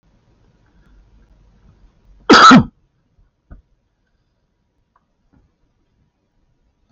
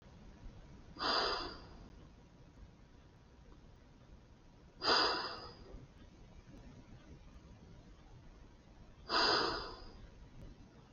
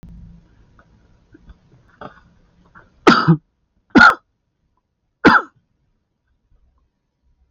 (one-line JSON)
{"cough_length": "6.9 s", "cough_amplitude": 32680, "cough_signal_mean_std_ratio": 0.21, "exhalation_length": "10.9 s", "exhalation_amplitude": 3953, "exhalation_signal_mean_std_ratio": 0.44, "three_cough_length": "7.5 s", "three_cough_amplitude": 29440, "three_cough_signal_mean_std_ratio": 0.24, "survey_phase": "alpha (2021-03-01 to 2021-08-12)", "age": "45-64", "gender": "Male", "wearing_mask": "No", "symptom_none": true, "smoker_status": "Never smoked", "respiratory_condition_asthma": false, "respiratory_condition_other": false, "recruitment_source": "REACT", "submission_delay": "2 days", "covid_test_result": "Negative", "covid_test_method": "RT-qPCR"}